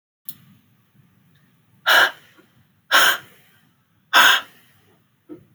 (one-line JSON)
{"exhalation_length": "5.5 s", "exhalation_amplitude": 29107, "exhalation_signal_mean_std_ratio": 0.31, "survey_phase": "beta (2021-08-13 to 2022-03-07)", "age": "45-64", "gender": "Female", "wearing_mask": "No", "symptom_cough_any": true, "symptom_new_continuous_cough": true, "symptom_runny_or_blocked_nose": true, "symptom_sore_throat": true, "symptom_fatigue": true, "smoker_status": "Never smoked", "respiratory_condition_asthma": false, "respiratory_condition_other": false, "recruitment_source": "Test and Trace", "submission_delay": "1 day", "covid_test_result": "Positive", "covid_test_method": "RT-qPCR", "covid_ct_value": 27.8, "covid_ct_gene": "N gene"}